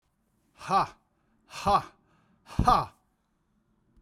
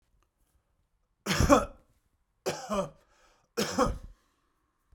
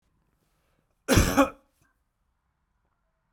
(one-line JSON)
{"exhalation_length": "4.0 s", "exhalation_amplitude": 13756, "exhalation_signal_mean_std_ratio": 0.32, "three_cough_length": "4.9 s", "three_cough_amplitude": 14201, "three_cough_signal_mean_std_ratio": 0.33, "cough_length": "3.3 s", "cough_amplitude": 16958, "cough_signal_mean_std_ratio": 0.26, "survey_phase": "beta (2021-08-13 to 2022-03-07)", "age": "45-64", "gender": "Male", "wearing_mask": "No", "symptom_runny_or_blocked_nose": true, "symptom_onset": "6 days", "smoker_status": "Never smoked", "respiratory_condition_asthma": false, "respiratory_condition_other": true, "recruitment_source": "REACT", "submission_delay": "0 days", "covid_test_result": "Negative", "covid_test_method": "RT-qPCR"}